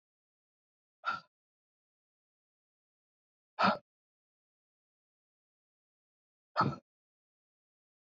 exhalation_length: 8.0 s
exhalation_amplitude: 5894
exhalation_signal_mean_std_ratio: 0.18
survey_phase: beta (2021-08-13 to 2022-03-07)
age: 18-44
gender: Female
wearing_mask: 'No'
symptom_new_continuous_cough: true
symptom_runny_or_blocked_nose: true
symptom_headache: true
symptom_onset: 2 days
smoker_status: Ex-smoker
respiratory_condition_asthma: false
respiratory_condition_other: false
recruitment_source: Test and Trace
submission_delay: 2 days
covid_test_result: Positive
covid_test_method: RT-qPCR
covid_ct_value: 22.6
covid_ct_gene: N gene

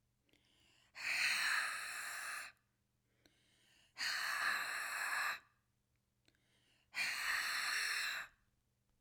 exhalation_length: 9.0 s
exhalation_amplitude: 1996
exhalation_signal_mean_std_ratio: 0.61
survey_phase: alpha (2021-03-01 to 2021-08-12)
age: 18-44
gender: Female
wearing_mask: 'No'
symptom_none: true
symptom_onset: 12 days
smoker_status: Never smoked
respiratory_condition_asthma: false
respiratory_condition_other: false
recruitment_source: REACT
submission_delay: 2 days
covid_test_result: Negative
covid_test_method: RT-qPCR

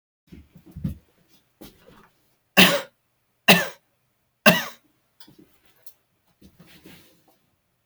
three_cough_length: 7.9 s
three_cough_amplitude: 32768
three_cough_signal_mean_std_ratio: 0.22
survey_phase: beta (2021-08-13 to 2022-03-07)
age: 65+
gender: Male
wearing_mask: 'No'
symptom_cough_any: true
symptom_sore_throat: true
symptom_onset: 2 days
smoker_status: Ex-smoker
respiratory_condition_asthma: false
respiratory_condition_other: false
recruitment_source: Test and Trace
submission_delay: 1 day
covid_test_result: Positive
covid_test_method: RT-qPCR
covid_ct_value: 19.7
covid_ct_gene: N gene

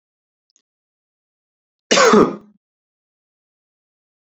cough_length: 4.3 s
cough_amplitude: 28885
cough_signal_mean_std_ratio: 0.25
survey_phase: beta (2021-08-13 to 2022-03-07)
age: 18-44
gender: Male
wearing_mask: 'No'
symptom_none: true
smoker_status: Never smoked
respiratory_condition_asthma: false
respiratory_condition_other: false
recruitment_source: REACT
submission_delay: 2 days
covid_test_result: Negative
covid_test_method: RT-qPCR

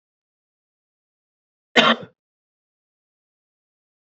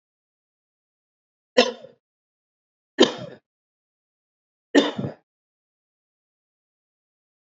cough_length: 4.0 s
cough_amplitude: 28370
cough_signal_mean_std_ratio: 0.17
three_cough_length: 7.6 s
three_cough_amplitude: 28830
three_cough_signal_mean_std_ratio: 0.18
survey_phase: beta (2021-08-13 to 2022-03-07)
age: 45-64
gender: Male
wearing_mask: 'No'
symptom_cough_any: true
symptom_runny_or_blocked_nose: true
symptom_sore_throat: true
symptom_headache: true
symptom_change_to_sense_of_smell_or_taste: true
smoker_status: Ex-smoker
respiratory_condition_asthma: false
respiratory_condition_other: false
recruitment_source: Test and Trace
submission_delay: 1 day
covid_test_result: Positive
covid_test_method: RT-qPCR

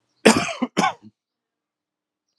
cough_length: 2.4 s
cough_amplitude: 32768
cough_signal_mean_std_ratio: 0.3
survey_phase: alpha (2021-03-01 to 2021-08-12)
age: 45-64
gender: Male
wearing_mask: 'No'
symptom_cough_any: true
symptom_fatigue: true
symptom_headache: true
symptom_onset: 7 days
smoker_status: Never smoked
respiratory_condition_asthma: false
respiratory_condition_other: false
recruitment_source: Test and Trace
submission_delay: 2 days
covid_test_result: Positive
covid_test_method: RT-qPCR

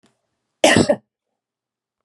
cough_length: 2.0 s
cough_amplitude: 32754
cough_signal_mean_std_ratio: 0.29
survey_phase: beta (2021-08-13 to 2022-03-07)
age: 65+
gender: Female
wearing_mask: 'No'
symptom_none: true
smoker_status: Never smoked
respiratory_condition_asthma: false
respiratory_condition_other: false
recruitment_source: Test and Trace
submission_delay: 2 days
covid_test_result: Positive
covid_test_method: RT-qPCR
covid_ct_value: 16.6
covid_ct_gene: N gene
covid_ct_mean: 17.1
covid_viral_load: 2400000 copies/ml
covid_viral_load_category: High viral load (>1M copies/ml)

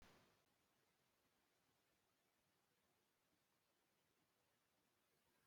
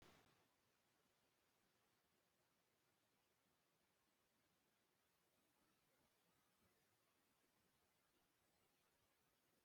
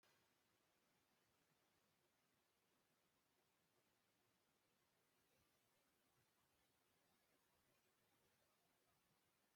cough_length: 5.5 s
cough_amplitude: 51
cough_signal_mean_std_ratio: 0.68
three_cough_length: 9.6 s
three_cough_amplitude: 48
three_cough_signal_mean_std_ratio: 0.8
exhalation_length: 9.6 s
exhalation_amplitude: 14
exhalation_signal_mean_std_ratio: 0.96
survey_phase: beta (2021-08-13 to 2022-03-07)
age: 65+
gender: Male
wearing_mask: 'No'
symptom_cough_any: true
symptom_runny_or_blocked_nose: true
symptom_fatigue: true
symptom_onset: 12 days
smoker_status: Ex-smoker
respiratory_condition_asthma: false
respiratory_condition_other: false
recruitment_source: REACT
submission_delay: 2 days
covid_test_result: Negative
covid_test_method: RT-qPCR
influenza_a_test_result: Negative
influenza_b_test_result: Negative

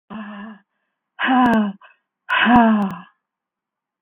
exhalation_length: 4.0 s
exhalation_amplitude: 26177
exhalation_signal_mean_std_ratio: 0.49
survey_phase: beta (2021-08-13 to 2022-03-07)
age: 45-64
gender: Female
wearing_mask: 'Yes'
symptom_none: true
smoker_status: Never smoked
respiratory_condition_asthma: false
respiratory_condition_other: false
recruitment_source: REACT
submission_delay: 3 days
covid_test_result: Negative
covid_test_method: RT-qPCR
influenza_a_test_result: Negative
influenza_b_test_result: Negative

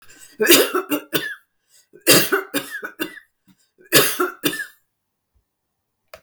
cough_length: 6.2 s
cough_amplitude: 32768
cough_signal_mean_std_ratio: 0.39
survey_phase: beta (2021-08-13 to 2022-03-07)
age: 45-64
gender: Female
wearing_mask: 'No'
symptom_none: true
smoker_status: Never smoked
respiratory_condition_asthma: false
respiratory_condition_other: false
recruitment_source: REACT
submission_delay: 1 day
covid_test_result: Negative
covid_test_method: RT-qPCR
influenza_a_test_result: Negative
influenza_b_test_result: Negative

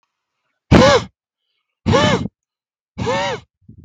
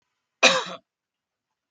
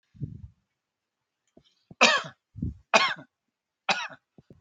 exhalation_length: 3.8 s
exhalation_amplitude: 32768
exhalation_signal_mean_std_ratio: 0.4
cough_length: 1.7 s
cough_amplitude: 31967
cough_signal_mean_std_ratio: 0.26
three_cough_length: 4.6 s
three_cough_amplitude: 24765
three_cough_signal_mean_std_ratio: 0.29
survey_phase: beta (2021-08-13 to 2022-03-07)
age: 45-64
gender: Male
wearing_mask: 'No'
symptom_none: true
smoker_status: Ex-smoker
respiratory_condition_asthma: false
respiratory_condition_other: false
recruitment_source: REACT
submission_delay: 1 day
covid_test_result: Negative
covid_test_method: RT-qPCR
influenza_a_test_result: Negative
influenza_b_test_result: Negative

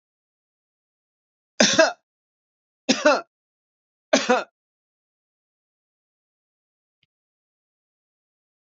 three_cough_length: 8.8 s
three_cough_amplitude: 27643
three_cough_signal_mean_std_ratio: 0.22
survey_phase: beta (2021-08-13 to 2022-03-07)
age: 65+
gender: Male
wearing_mask: 'No'
symptom_none: true
smoker_status: Never smoked
respiratory_condition_asthma: false
respiratory_condition_other: false
recruitment_source: REACT
submission_delay: 2 days
covid_test_result: Negative
covid_test_method: RT-qPCR
influenza_a_test_result: Negative
influenza_b_test_result: Negative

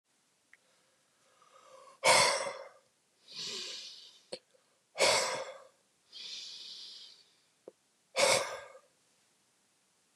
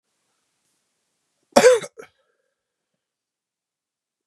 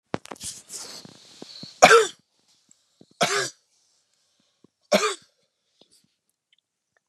exhalation_length: 10.2 s
exhalation_amplitude: 9619
exhalation_signal_mean_std_ratio: 0.34
cough_length: 4.3 s
cough_amplitude: 32767
cough_signal_mean_std_ratio: 0.19
three_cough_length: 7.1 s
three_cough_amplitude: 32768
three_cough_signal_mean_std_ratio: 0.24
survey_phase: beta (2021-08-13 to 2022-03-07)
age: 18-44
gender: Male
wearing_mask: 'No'
symptom_cough_any: true
symptom_fatigue: true
symptom_onset: 4 days
smoker_status: Ex-smoker
respiratory_condition_asthma: false
respiratory_condition_other: false
recruitment_source: Test and Trace
submission_delay: 2 days
covid_test_result: Positive
covid_test_method: RT-qPCR
covid_ct_value: 18.5
covid_ct_gene: ORF1ab gene
covid_ct_mean: 18.6
covid_viral_load: 780000 copies/ml
covid_viral_load_category: Low viral load (10K-1M copies/ml)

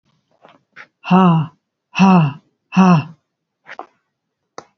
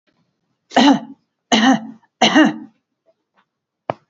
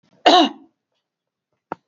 exhalation_length: 4.8 s
exhalation_amplitude: 27735
exhalation_signal_mean_std_ratio: 0.42
three_cough_length: 4.1 s
three_cough_amplitude: 30021
three_cough_signal_mean_std_ratio: 0.38
cough_length: 1.9 s
cough_amplitude: 28998
cough_signal_mean_std_ratio: 0.29
survey_phase: alpha (2021-03-01 to 2021-08-12)
age: 65+
gender: Female
wearing_mask: 'No'
symptom_none: true
smoker_status: Never smoked
respiratory_condition_asthma: false
respiratory_condition_other: false
recruitment_source: REACT
submission_delay: 5 days
covid_test_result: Negative
covid_test_method: RT-qPCR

